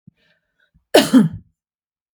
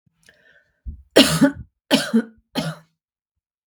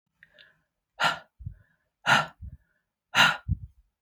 {
  "cough_length": "2.1 s",
  "cough_amplitude": 32768,
  "cough_signal_mean_std_ratio": 0.3,
  "three_cough_length": "3.7 s",
  "three_cough_amplitude": 32768,
  "three_cough_signal_mean_std_ratio": 0.34,
  "exhalation_length": "4.0 s",
  "exhalation_amplitude": 18911,
  "exhalation_signal_mean_std_ratio": 0.32,
  "survey_phase": "beta (2021-08-13 to 2022-03-07)",
  "age": "45-64",
  "gender": "Female",
  "wearing_mask": "No",
  "symptom_none": true,
  "smoker_status": "Ex-smoker",
  "respiratory_condition_asthma": false,
  "respiratory_condition_other": false,
  "recruitment_source": "REACT",
  "submission_delay": "1 day",
  "covid_test_result": "Negative",
  "covid_test_method": "RT-qPCR",
  "influenza_a_test_result": "Negative",
  "influenza_b_test_result": "Negative"
}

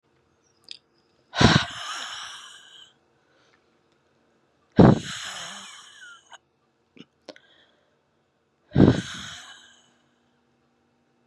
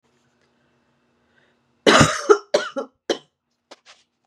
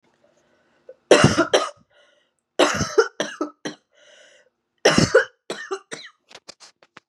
{
  "exhalation_length": "11.3 s",
  "exhalation_amplitude": 32577,
  "exhalation_signal_mean_std_ratio": 0.24,
  "cough_length": "4.3 s",
  "cough_amplitude": 31490,
  "cough_signal_mean_std_ratio": 0.28,
  "three_cough_length": "7.1 s",
  "three_cough_amplitude": 32768,
  "three_cough_signal_mean_std_ratio": 0.33,
  "survey_phase": "beta (2021-08-13 to 2022-03-07)",
  "age": "18-44",
  "gender": "Female",
  "wearing_mask": "No",
  "symptom_cough_any": true,
  "symptom_runny_or_blocked_nose": true,
  "symptom_shortness_of_breath": true,
  "symptom_sore_throat": true,
  "symptom_fatigue": true,
  "symptom_headache": true,
  "symptom_onset": "2 days",
  "smoker_status": "Current smoker (1 to 10 cigarettes per day)",
  "respiratory_condition_asthma": false,
  "respiratory_condition_other": false,
  "recruitment_source": "Test and Trace",
  "submission_delay": "1 day",
  "covid_test_result": "Positive",
  "covid_test_method": "RT-qPCR",
  "covid_ct_value": 19.4,
  "covid_ct_gene": "ORF1ab gene"
}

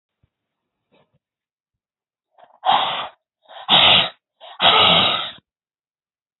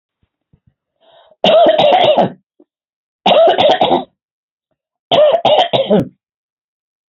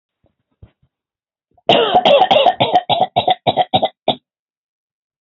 {
  "exhalation_length": "6.4 s",
  "exhalation_amplitude": 32223,
  "exhalation_signal_mean_std_ratio": 0.38,
  "three_cough_length": "7.1 s",
  "three_cough_amplitude": 30078,
  "three_cough_signal_mean_std_ratio": 0.52,
  "cough_length": "5.2 s",
  "cough_amplitude": 30200,
  "cough_signal_mean_std_ratio": 0.46,
  "survey_phase": "beta (2021-08-13 to 2022-03-07)",
  "age": "65+",
  "gender": "Female",
  "wearing_mask": "No",
  "symptom_none": true,
  "smoker_status": "Never smoked",
  "respiratory_condition_asthma": false,
  "respiratory_condition_other": false,
  "recruitment_source": "REACT",
  "submission_delay": "2 days",
  "covid_test_result": "Negative",
  "covid_test_method": "RT-qPCR",
  "influenza_a_test_result": "Negative",
  "influenza_b_test_result": "Negative"
}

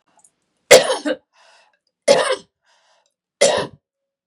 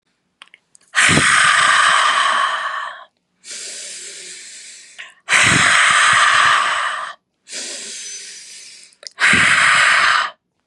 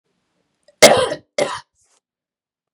{
  "three_cough_length": "4.3 s",
  "three_cough_amplitude": 32768,
  "three_cough_signal_mean_std_ratio": 0.31,
  "exhalation_length": "10.7 s",
  "exhalation_amplitude": 32759,
  "exhalation_signal_mean_std_ratio": 0.65,
  "cough_length": "2.7 s",
  "cough_amplitude": 32768,
  "cough_signal_mean_std_ratio": 0.27,
  "survey_phase": "beta (2021-08-13 to 2022-03-07)",
  "age": "45-64",
  "gender": "Female",
  "wearing_mask": "No",
  "symptom_none": true,
  "smoker_status": "Ex-smoker",
  "respiratory_condition_asthma": false,
  "respiratory_condition_other": false,
  "recruitment_source": "REACT",
  "submission_delay": "0 days",
  "covid_test_result": "Negative",
  "covid_test_method": "RT-qPCR",
  "influenza_a_test_result": "Negative",
  "influenza_b_test_result": "Negative"
}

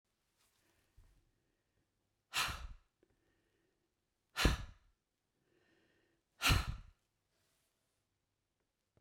{
  "exhalation_length": "9.0 s",
  "exhalation_amplitude": 4462,
  "exhalation_signal_mean_std_ratio": 0.23,
  "survey_phase": "beta (2021-08-13 to 2022-03-07)",
  "age": "65+",
  "gender": "Male",
  "wearing_mask": "No",
  "symptom_none": true,
  "smoker_status": "Ex-smoker",
  "respiratory_condition_asthma": false,
  "respiratory_condition_other": false,
  "recruitment_source": "REACT",
  "submission_delay": "2 days",
  "covid_test_result": "Negative",
  "covid_test_method": "RT-qPCR"
}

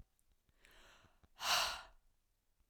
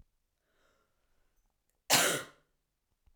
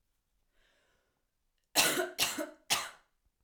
{
  "exhalation_length": "2.7 s",
  "exhalation_amplitude": 2711,
  "exhalation_signal_mean_std_ratio": 0.33,
  "cough_length": "3.2 s",
  "cough_amplitude": 9957,
  "cough_signal_mean_std_ratio": 0.25,
  "three_cough_length": "3.4 s",
  "three_cough_amplitude": 8285,
  "three_cough_signal_mean_std_ratio": 0.36,
  "survey_phase": "beta (2021-08-13 to 2022-03-07)",
  "age": "18-44",
  "gender": "Female",
  "wearing_mask": "No",
  "symptom_cough_any": true,
  "symptom_runny_or_blocked_nose": true,
  "symptom_sore_throat": true,
  "symptom_fatigue": true,
  "symptom_headache": true,
  "symptom_other": true,
  "smoker_status": "Never smoked",
  "respiratory_condition_asthma": false,
  "respiratory_condition_other": false,
  "recruitment_source": "Test and Trace",
  "submission_delay": "1 day",
  "covid_test_result": "Positive",
  "covid_test_method": "RT-qPCR",
  "covid_ct_value": 18.6,
  "covid_ct_gene": "N gene",
  "covid_ct_mean": 19.1,
  "covid_viral_load": "560000 copies/ml",
  "covid_viral_load_category": "Low viral load (10K-1M copies/ml)"
}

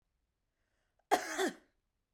{
  "cough_length": "2.1 s",
  "cough_amplitude": 6686,
  "cough_signal_mean_std_ratio": 0.29,
  "survey_phase": "beta (2021-08-13 to 2022-03-07)",
  "age": "18-44",
  "gender": "Female",
  "wearing_mask": "No",
  "symptom_none": true,
  "smoker_status": "Never smoked",
  "respiratory_condition_asthma": false,
  "respiratory_condition_other": false,
  "recruitment_source": "REACT",
  "submission_delay": "2 days",
  "covid_test_result": "Negative",
  "covid_test_method": "RT-qPCR"
}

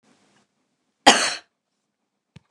{
  "cough_length": "2.5 s",
  "cough_amplitude": 29204,
  "cough_signal_mean_std_ratio": 0.22,
  "survey_phase": "beta (2021-08-13 to 2022-03-07)",
  "age": "65+",
  "gender": "Female",
  "wearing_mask": "No",
  "symptom_none": true,
  "smoker_status": "Never smoked",
  "respiratory_condition_asthma": false,
  "respiratory_condition_other": false,
  "recruitment_source": "REACT",
  "submission_delay": "1 day",
  "covid_test_result": "Negative",
  "covid_test_method": "RT-qPCR",
  "influenza_a_test_result": "Negative",
  "influenza_b_test_result": "Negative"
}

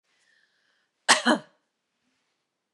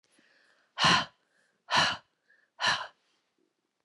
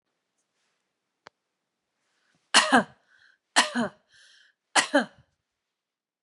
{
  "cough_length": "2.7 s",
  "cough_amplitude": 25951,
  "cough_signal_mean_std_ratio": 0.22,
  "exhalation_length": "3.8 s",
  "exhalation_amplitude": 10895,
  "exhalation_signal_mean_std_ratio": 0.34,
  "three_cough_length": "6.2 s",
  "three_cough_amplitude": 21568,
  "three_cough_signal_mean_std_ratio": 0.25,
  "survey_phase": "beta (2021-08-13 to 2022-03-07)",
  "age": "45-64",
  "gender": "Female",
  "wearing_mask": "No",
  "symptom_none": true,
  "smoker_status": "Never smoked",
  "respiratory_condition_asthma": false,
  "respiratory_condition_other": false,
  "recruitment_source": "REACT",
  "submission_delay": "2 days",
  "covid_test_result": "Negative",
  "covid_test_method": "RT-qPCR",
  "influenza_a_test_result": "Negative",
  "influenza_b_test_result": "Negative"
}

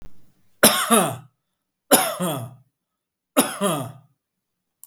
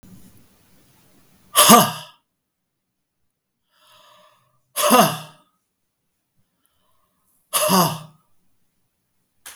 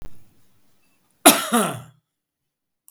{
  "three_cough_length": "4.9 s",
  "three_cough_amplitude": 32768,
  "three_cough_signal_mean_std_ratio": 0.4,
  "exhalation_length": "9.6 s",
  "exhalation_amplitude": 32768,
  "exhalation_signal_mean_std_ratio": 0.27,
  "cough_length": "2.9 s",
  "cough_amplitude": 32768,
  "cough_signal_mean_std_ratio": 0.29,
  "survey_phase": "beta (2021-08-13 to 2022-03-07)",
  "age": "65+",
  "gender": "Male",
  "wearing_mask": "No",
  "symptom_none": true,
  "smoker_status": "Never smoked",
  "respiratory_condition_asthma": false,
  "respiratory_condition_other": false,
  "recruitment_source": "REACT",
  "submission_delay": "0 days",
  "covid_test_result": "Negative",
  "covid_test_method": "RT-qPCR"
}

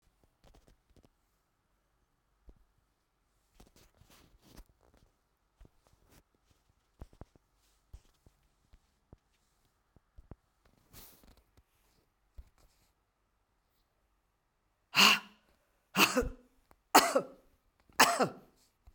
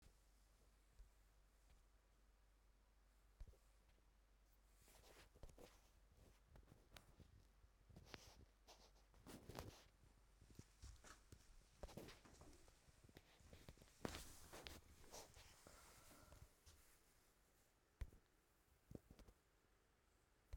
{
  "three_cough_length": "18.9 s",
  "three_cough_amplitude": 16585,
  "three_cough_signal_mean_std_ratio": 0.18,
  "cough_length": "20.6 s",
  "cough_amplitude": 972,
  "cough_signal_mean_std_ratio": 0.6,
  "survey_phase": "beta (2021-08-13 to 2022-03-07)",
  "age": "65+",
  "gender": "Female",
  "wearing_mask": "No",
  "symptom_cough_any": true,
  "symptom_shortness_of_breath": true,
  "symptom_fatigue": true,
  "symptom_change_to_sense_of_smell_or_taste": true,
  "symptom_other": true,
  "symptom_onset": "3 days",
  "smoker_status": "Never smoked",
  "respiratory_condition_asthma": false,
  "respiratory_condition_other": false,
  "recruitment_source": "Test and Trace",
  "submission_delay": "1 day",
  "covid_test_result": "Positive",
  "covid_test_method": "RT-qPCR",
  "covid_ct_value": 17.7,
  "covid_ct_gene": "ORF1ab gene"
}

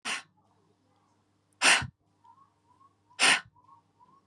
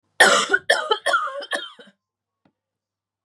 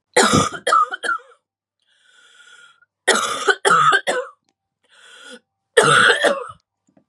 {
  "exhalation_length": "4.3 s",
  "exhalation_amplitude": 14479,
  "exhalation_signal_mean_std_ratio": 0.28,
  "cough_length": "3.2 s",
  "cough_amplitude": 29816,
  "cough_signal_mean_std_ratio": 0.41,
  "three_cough_length": "7.1 s",
  "three_cough_amplitude": 32768,
  "three_cough_signal_mean_std_ratio": 0.47,
  "survey_phase": "beta (2021-08-13 to 2022-03-07)",
  "age": "18-44",
  "gender": "Female",
  "wearing_mask": "No",
  "symptom_headache": true,
  "smoker_status": "Never smoked",
  "respiratory_condition_asthma": false,
  "respiratory_condition_other": false,
  "recruitment_source": "Test and Trace",
  "submission_delay": "1 day",
  "covid_test_result": "Positive",
  "covid_test_method": "RT-qPCR",
  "covid_ct_value": 30.7,
  "covid_ct_gene": "N gene",
  "covid_ct_mean": 30.8,
  "covid_viral_load": "81 copies/ml",
  "covid_viral_load_category": "Minimal viral load (< 10K copies/ml)"
}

